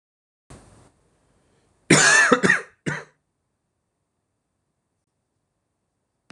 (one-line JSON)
{"cough_length": "6.3 s", "cough_amplitude": 26028, "cough_signal_mean_std_ratio": 0.27, "survey_phase": "beta (2021-08-13 to 2022-03-07)", "age": "18-44", "gender": "Male", "wearing_mask": "No", "symptom_none": true, "smoker_status": "Never smoked", "respiratory_condition_asthma": false, "respiratory_condition_other": false, "recruitment_source": "REACT", "submission_delay": "6 days", "covid_test_result": "Negative", "covid_test_method": "RT-qPCR", "influenza_a_test_result": "Negative", "influenza_b_test_result": "Negative"}